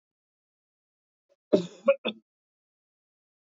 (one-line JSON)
{"cough_length": "3.5 s", "cough_amplitude": 11745, "cough_signal_mean_std_ratio": 0.19, "survey_phase": "alpha (2021-03-01 to 2021-08-12)", "age": "45-64", "gender": "Male", "wearing_mask": "No", "symptom_none": true, "smoker_status": "Never smoked", "respiratory_condition_asthma": false, "respiratory_condition_other": false, "recruitment_source": "REACT", "submission_delay": "6 days", "covid_test_result": "Negative", "covid_test_method": "RT-qPCR"}